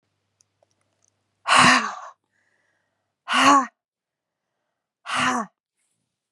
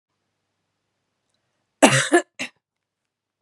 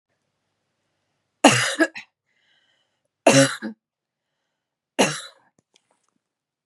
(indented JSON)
{
  "exhalation_length": "6.3 s",
  "exhalation_amplitude": 25601,
  "exhalation_signal_mean_std_ratio": 0.33,
  "cough_length": "3.4 s",
  "cough_amplitude": 32767,
  "cough_signal_mean_std_ratio": 0.23,
  "three_cough_length": "6.7 s",
  "three_cough_amplitude": 32743,
  "three_cough_signal_mean_std_ratio": 0.26,
  "survey_phase": "beta (2021-08-13 to 2022-03-07)",
  "age": "18-44",
  "gender": "Female",
  "wearing_mask": "No",
  "symptom_none": true,
  "smoker_status": "Ex-smoker",
  "respiratory_condition_asthma": true,
  "respiratory_condition_other": false,
  "recruitment_source": "REACT",
  "submission_delay": "1 day",
  "covid_test_result": "Negative",
  "covid_test_method": "RT-qPCR",
  "influenza_a_test_result": "Negative",
  "influenza_b_test_result": "Negative"
}